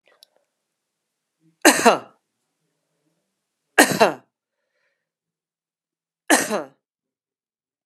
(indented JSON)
{
  "three_cough_length": "7.9 s",
  "three_cough_amplitude": 32768,
  "three_cough_signal_mean_std_ratio": 0.22,
  "survey_phase": "beta (2021-08-13 to 2022-03-07)",
  "age": "45-64",
  "gender": "Female",
  "wearing_mask": "No",
  "symptom_cough_any": true,
  "symptom_runny_or_blocked_nose": true,
  "symptom_abdominal_pain": true,
  "symptom_fatigue": true,
  "symptom_headache": true,
  "symptom_change_to_sense_of_smell_or_taste": true,
  "smoker_status": "Never smoked",
  "respiratory_condition_asthma": false,
  "respiratory_condition_other": false,
  "recruitment_source": "Test and Trace",
  "submission_delay": "2 days",
  "covid_test_result": "Positive",
  "covid_test_method": "RT-qPCR",
  "covid_ct_value": 19.1,
  "covid_ct_gene": "ORF1ab gene",
  "covid_ct_mean": 20.0,
  "covid_viral_load": "280000 copies/ml",
  "covid_viral_load_category": "Low viral load (10K-1M copies/ml)"
}